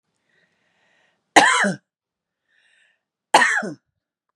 {"cough_length": "4.4 s", "cough_amplitude": 32768, "cough_signal_mean_std_ratio": 0.3, "survey_phase": "beta (2021-08-13 to 2022-03-07)", "age": "45-64", "gender": "Female", "wearing_mask": "No", "symptom_none": true, "smoker_status": "Ex-smoker", "respiratory_condition_asthma": true, "respiratory_condition_other": false, "recruitment_source": "REACT", "submission_delay": "1 day", "covid_test_result": "Negative", "covid_test_method": "RT-qPCR", "influenza_a_test_result": "Unknown/Void", "influenza_b_test_result": "Unknown/Void"}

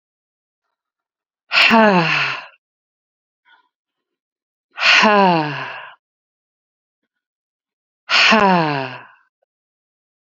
{"exhalation_length": "10.2 s", "exhalation_amplitude": 30235, "exhalation_signal_mean_std_ratio": 0.38, "survey_phase": "beta (2021-08-13 to 2022-03-07)", "age": "45-64", "gender": "Female", "wearing_mask": "No", "symptom_cough_any": true, "symptom_runny_or_blocked_nose": true, "symptom_sore_throat": true, "symptom_fatigue": true, "symptom_headache": true, "symptom_change_to_sense_of_smell_or_taste": true, "symptom_loss_of_taste": true, "symptom_onset": "2 days", "smoker_status": "Ex-smoker", "respiratory_condition_asthma": false, "respiratory_condition_other": false, "recruitment_source": "Test and Trace", "submission_delay": "1 day", "covid_test_result": "Positive", "covid_test_method": "RT-qPCR", "covid_ct_value": 18.8, "covid_ct_gene": "ORF1ab gene", "covid_ct_mean": 19.0, "covid_viral_load": "570000 copies/ml", "covid_viral_load_category": "Low viral load (10K-1M copies/ml)"}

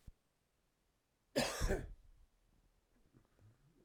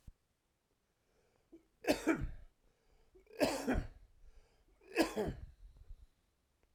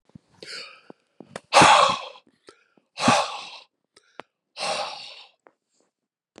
{"cough_length": "3.8 s", "cough_amplitude": 2298, "cough_signal_mean_std_ratio": 0.31, "three_cough_length": "6.7 s", "three_cough_amplitude": 4207, "three_cough_signal_mean_std_ratio": 0.36, "exhalation_length": "6.4 s", "exhalation_amplitude": 27095, "exhalation_signal_mean_std_ratio": 0.31, "survey_phase": "alpha (2021-03-01 to 2021-08-12)", "age": "45-64", "gender": "Male", "wearing_mask": "No", "symptom_cough_any": true, "symptom_fatigue": true, "symptom_headache": true, "symptom_onset": "3 days", "smoker_status": "Never smoked", "respiratory_condition_asthma": false, "respiratory_condition_other": false, "recruitment_source": "Test and Trace", "submission_delay": "1 day", "covid_test_result": "Positive", "covid_test_method": "RT-qPCR"}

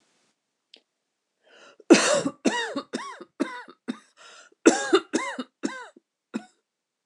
{"cough_length": "7.1 s", "cough_amplitude": 25969, "cough_signal_mean_std_ratio": 0.32, "survey_phase": "beta (2021-08-13 to 2022-03-07)", "age": "45-64", "gender": "Female", "wearing_mask": "No", "symptom_none": true, "smoker_status": "Ex-smoker", "respiratory_condition_asthma": false, "respiratory_condition_other": false, "recruitment_source": "REACT", "submission_delay": "0 days", "covid_test_result": "Negative", "covid_test_method": "RT-qPCR"}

